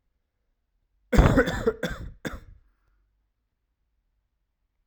{"cough_length": "4.9 s", "cough_amplitude": 22149, "cough_signal_mean_std_ratio": 0.28, "survey_phase": "alpha (2021-03-01 to 2021-08-12)", "age": "18-44", "gender": "Male", "wearing_mask": "No", "symptom_cough_any": true, "symptom_fatigue": true, "symptom_fever_high_temperature": true, "symptom_loss_of_taste": true, "symptom_onset": "4 days", "smoker_status": "Never smoked", "respiratory_condition_asthma": false, "respiratory_condition_other": false, "recruitment_source": "Test and Trace", "submission_delay": "1 day", "covid_test_result": "Positive", "covid_test_method": "RT-qPCR", "covid_ct_value": 17.6, "covid_ct_gene": "ORF1ab gene"}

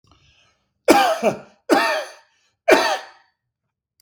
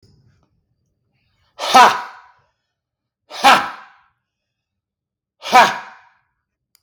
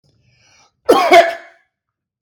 {"three_cough_length": "4.0 s", "three_cough_amplitude": 32766, "three_cough_signal_mean_std_ratio": 0.41, "exhalation_length": "6.8 s", "exhalation_amplitude": 32768, "exhalation_signal_mean_std_ratio": 0.27, "cough_length": "2.2 s", "cough_amplitude": 32768, "cough_signal_mean_std_ratio": 0.35, "survey_phase": "beta (2021-08-13 to 2022-03-07)", "age": "45-64", "gender": "Male", "wearing_mask": "No", "symptom_none": true, "smoker_status": "Never smoked", "respiratory_condition_asthma": false, "respiratory_condition_other": false, "recruitment_source": "REACT", "submission_delay": "1 day", "covid_test_result": "Negative", "covid_test_method": "RT-qPCR"}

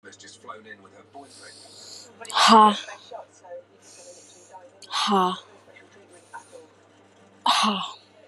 {"exhalation_length": "8.3 s", "exhalation_amplitude": 24532, "exhalation_signal_mean_std_ratio": 0.34, "survey_phase": "beta (2021-08-13 to 2022-03-07)", "age": "18-44", "gender": "Female", "wearing_mask": "No", "symptom_none": true, "smoker_status": "Current smoker (1 to 10 cigarettes per day)", "respiratory_condition_asthma": false, "respiratory_condition_other": false, "recruitment_source": "REACT", "submission_delay": "2 days", "covid_test_result": "Negative", "covid_test_method": "RT-qPCR"}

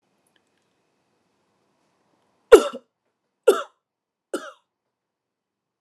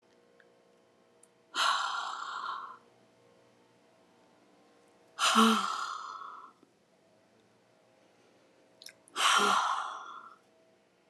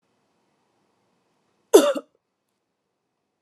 {"three_cough_length": "5.8 s", "three_cough_amplitude": 29204, "three_cough_signal_mean_std_ratio": 0.15, "exhalation_length": "11.1 s", "exhalation_amplitude": 9170, "exhalation_signal_mean_std_ratio": 0.39, "cough_length": "3.4 s", "cough_amplitude": 29203, "cough_signal_mean_std_ratio": 0.18, "survey_phase": "alpha (2021-03-01 to 2021-08-12)", "age": "45-64", "gender": "Female", "wearing_mask": "No", "symptom_none": true, "symptom_onset": "12 days", "smoker_status": "Never smoked", "respiratory_condition_asthma": false, "respiratory_condition_other": false, "recruitment_source": "REACT", "submission_delay": "2 days", "covid_test_result": "Negative", "covid_test_method": "RT-qPCR"}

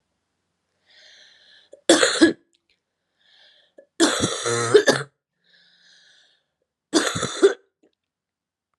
{"three_cough_length": "8.8 s", "three_cough_amplitude": 28871, "three_cough_signal_mean_std_ratio": 0.32, "survey_phase": "beta (2021-08-13 to 2022-03-07)", "age": "18-44", "gender": "Female", "wearing_mask": "No", "symptom_cough_any": true, "symptom_runny_or_blocked_nose": true, "symptom_shortness_of_breath": true, "symptom_fatigue": true, "symptom_headache": true, "symptom_onset": "5 days", "smoker_status": "Ex-smoker", "respiratory_condition_asthma": false, "respiratory_condition_other": false, "recruitment_source": "Test and Trace", "submission_delay": "2 days", "covid_test_result": "Positive", "covid_test_method": "RT-qPCR", "covid_ct_value": 26.6, "covid_ct_gene": "ORF1ab gene", "covid_ct_mean": 26.9, "covid_viral_load": "1500 copies/ml", "covid_viral_load_category": "Minimal viral load (< 10K copies/ml)"}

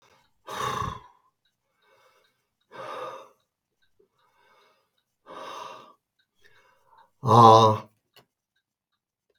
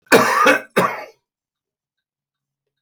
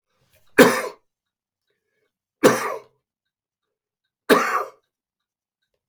{"exhalation_length": "9.4 s", "exhalation_amplitude": 28568, "exhalation_signal_mean_std_ratio": 0.23, "cough_length": "2.8 s", "cough_amplitude": 32768, "cough_signal_mean_std_ratio": 0.39, "three_cough_length": "5.9 s", "three_cough_amplitude": 32768, "three_cough_signal_mean_std_ratio": 0.26, "survey_phase": "beta (2021-08-13 to 2022-03-07)", "age": "65+", "gender": "Male", "wearing_mask": "No", "symptom_none": true, "smoker_status": "Ex-smoker", "respiratory_condition_asthma": false, "respiratory_condition_other": false, "recruitment_source": "REACT", "submission_delay": "2 days", "covid_test_result": "Negative", "covid_test_method": "RT-qPCR", "influenza_a_test_result": "Negative", "influenza_b_test_result": "Negative"}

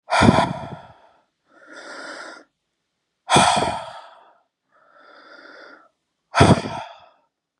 {"exhalation_length": "7.6 s", "exhalation_amplitude": 32578, "exhalation_signal_mean_std_ratio": 0.34, "survey_phase": "beta (2021-08-13 to 2022-03-07)", "age": "18-44", "gender": "Male", "wearing_mask": "No", "symptom_sore_throat": true, "symptom_headache": true, "smoker_status": "Ex-smoker", "respiratory_condition_asthma": false, "respiratory_condition_other": false, "recruitment_source": "Test and Trace", "submission_delay": "2 days", "covid_test_result": "Positive", "covid_test_method": "LFT"}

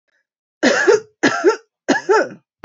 {"three_cough_length": "2.6 s", "three_cough_amplitude": 28328, "three_cough_signal_mean_std_ratio": 0.51, "survey_phase": "beta (2021-08-13 to 2022-03-07)", "age": "18-44", "gender": "Female", "wearing_mask": "No", "symptom_runny_or_blocked_nose": true, "symptom_sore_throat": true, "symptom_fatigue": true, "symptom_headache": true, "symptom_onset": "12 days", "smoker_status": "Never smoked", "respiratory_condition_asthma": false, "respiratory_condition_other": false, "recruitment_source": "REACT", "submission_delay": "2 days", "covid_test_result": "Negative", "covid_test_method": "RT-qPCR"}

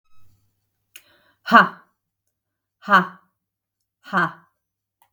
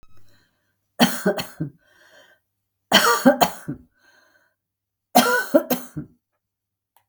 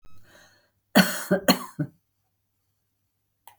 {"exhalation_length": "5.1 s", "exhalation_amplitude": 32768, "exhalation_signal_mean_std_ratio": 0.24, "three_cough_length": "7.1 s", "three_cough_amplitude": 32766, "three_cough_signal_mean_std_ratio": 0.35, "cough_length": "3.6 s", "cough_amplitude": 22645, "cough_signal_mean_std_ratio": 0.28, "survey_phase": "beta (2021-08-13 to 2022-03-07)", "age": "45-64", "gender": "Female", "wearing_mask": "No", "symptom_cough_any": true, "symptom_new_continuous_cough": true, "symptom_sore_throat": true, "symptom_fatigue": true, "symptom_change_to_sense_of_smell_or_taste": true, "symptom_onset": "8 days", "smoker_status": "Ex-smoker", "respiratory_condition_asthma": false, "respiratory_condition_other": false, "recruitment_source": "REACT", "submission_delay": "0 days", "covid_test_result": "Positive", "covid_test_method": "RT-qPCR", "covid_ct_value": 25.0, "covid_ct_gene": "E gene", "influenza_a_test_result": "Negative", "influenza_b_test_result": "Negative"}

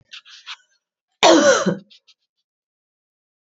{"cough_length": "3.5 s", "cough_amplitude": 32768, "cough_signal_mean_std_ratio": 0.31, "survey_phase": "beta (2021-08-13 to 2022-03-07)", "age": "45-64", "gender": "Female", "wearing_mask": "No", "symptom_cough_any": true, "symptom_runny_or_blocked_nose": true, "symptom_sore_throat": true, "symptom_fatigue": true, "symptom_headache": true, "symptom_onset": "4 days", "smoker_status": "Never smoked", "respiratory_condition_asthma": false, "respiratory_condition_other": false, "recruitment_source": "Test and Trace", "submission_delay": "1 day", "covid_test_result": "Positive", "covid_test_method": "RT-qPCR", "covid_ct_value": 21.8, "covid_ct_gene": "N gene"}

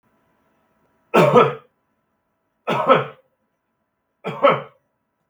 {"three_cough_length": "5.3 s", "three_cough_amplitude": 32768, "three_cough_signal_mean_std_ratio": 0.33, "survey_phase": "beta (2021-08-13 to 2022-03-07)", "age": "45-64", "gender": "Male", "wearing_mask": "No", "symptom_none": true, "smoker_status": "Never smoked", "respiratory_condition_asthma": true, "respiratory_condition_other": false, "recruitment_source": "REACT", "submission_delay": "1 day", "covid_test_result": "Negative", "covid_test_method": "RT-qPCR", "influenza_a_test_result": "Negative", "influenza_b_test_result": "Negative"}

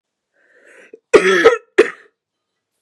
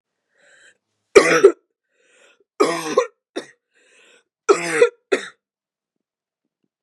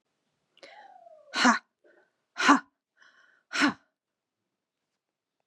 {"cough_length": "2.8 s", "cough_amplitude": 32768, "cough_signal_mean_std_ratio": 0.32, "three_cough_length": "6.8 s", "three_cough_amplitude": 32768, "three_cough_signal_mean_std_ratio": 0.28, "exhalation_length": "5.5 s", "exhalation_amplitude": 20213, "exhalation_signal_mean_std_ratio": 0.25, "survey_phase": "beta (2021-08-13 to 2022-03-07)", "age": "18-44", "gender": "Female", "wearing_mask": "No", "symptom_cough_any": true, "symptom_new_continuous_cough": true, "symptom_runny_or_blocked_nose": true, "symptom_shortness_of_breath": true, "symptom_sore_throat": true, "symptom_fatigue": true, "symptom_onset": "2 days", "smoker_status": "Ex-smoker", "respiratory_condition_asthma": true, "respiratory_condition_other": false, "recruitment_source": "Test and Trace", "submission_delay": "1 day", "covid_test_result": "Negative", "covid_test_method": "RT-qPCR"}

